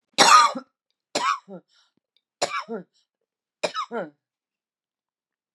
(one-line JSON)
{"three_cough_length": "5.5 s", "three_cough_amplitude": 28905, "three_cough_signal_mean_std_ratio": 0.3, "survey_phase": "beta (2021-08-13 to 2022-03-07)", "age": "45-64", "gender": "Female", "wearing_mask": "No", "symptom_cough_any": true, "symptom_new_continuous_cough": true, "symptom_runny_or_blocked_nose": true, "symptom_shortness_of_breath": true, "symptom_sore_throat": true, "symptom_abdominal_pain": true, "symptom_fatigue": true, "symptom_fever_high_temperature": true, "symptom_headache": true, "symptom_change_to_sense_of_smell_or_taste": true, "symptom_other": true, "smoker_status": "Ex-smoker", "respiratory_condition_asthma": false, "respiratory_condition_other": false, "recruitment_source": "Test and Trace", "submission_delay": "1 day", "covid_test_result": "Positive", "covid_test_method": "RT-qPCR", "covid_ct_value": 27.9, "covid_ct_gene": "N gene"}